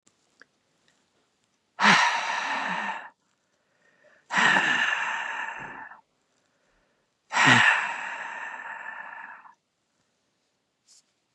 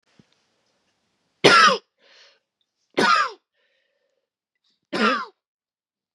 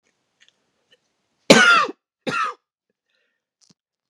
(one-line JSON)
{"exhalation_length": "11.3 s", "exhalation_amplitude": 22368, "exhalation_signal_mean_std_ratio": 0.42, "three_cough_length": "6.1 s", "three_cough_amplitude": 32689, "three_cough_signal_mean_std_ratio": 0.3, "cough_length": "4.1 s", "cough_amplitude": 32768, "cough_signal_mean_std_ratio": 0.28, "survey_phase": "beta (2021-08-13 to 2022-03-07)", "age": "18-44", "gender": "Female", "wearing_mask": "Yes", "symptom_cough_any": true, "symptom_new_continuous_cough": true, "symptom_runny_or_blocked_nose": true, "symptom_shortness_of_breath": true, "symptom_sore_throat": true, "symptom_abdominal_pain": true, "symptom_fatigue": true, "symptom_headache": true, "symptom_change_to_sense_of_smell_or_taste": true, "symptom_loss_of_taste": true, "smoker_status": "Never smoked", "respiratory_condition_asthma": false, "respiratory_condition_other": false, "recruitment_source": "Test and Trace", "submission_delay": "0 days", "covid_test_result": "Positive", "covid_test_method": "LFT"}